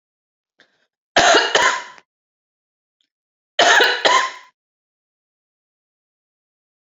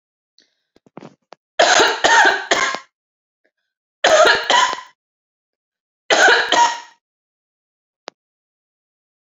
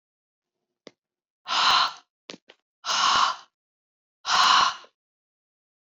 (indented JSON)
{
  "cough_length": "7.0 s",
  "cough_amplitude": 29684,
  "cough_signal_mean_std_ratio": 0.34,
  "three_cough_length": "9.4 s",
  "three_cough_amplitude": 31422,
  "three_cough_signal_mean_std_ratio": 0.4,
  "exhalation_length": "5.8 s",
  "exhalation_amplitude": 18395,
  "exhalation_signal_mean_std_ratio": 0.4,
  "survey_phase": "beta (2021-08-13 to 2022-03-07)",
  "age": "45-64",
  "gender": "Female",
  "wearing_mask": "No",
  "symptom_cough_any": true,
  "symptom_onset": "12 days",
  "smoker_status": "Ex-smoker",
  "respiratory_condition_asthma": false,
  "respiratory_condition_other": false,
  "recruitment_source": "REACT",
  "submission_delay": "1 day",
  "covid_test_result": "Negative",
  "covid_test_method": "RT-qPCR"
}